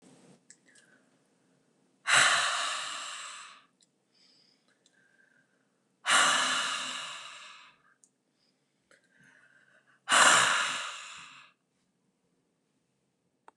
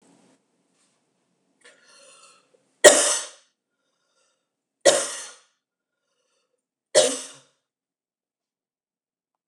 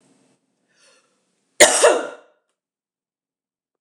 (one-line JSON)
{"exhalation_length": "13.6 s", "exhalation_amplitude": 13296, "exhalation_signal_mean_std_ratio": 0.35, "three_cough_length": "9.5 s", "three_cough_amplitude": 29204, "three_cough_signal_mean_std_ratio": 0.2, "cough_length": "3.8 s", "cough_amplitude": 29204, "cough_signal_mean_std_ratio": 0.24, "survey_phase": "beta (2021-08-13 to 2022-03-07)", "age": "45-64", "gender": "Female", "wearing_mask": "No", "symptom_none": true, "smoker_status": "Ex-smoker", "respiratory_condition_asthma": false, "respiratory_condition_other": false, "recruitment_source": "REACT", "submission_delay": "4 days", "covid_test_result": "Negative", "covid_test_method": "RT-qPCR", "influenza_a_test_result": "Negative", "influenza_b_test_result": "Negative"}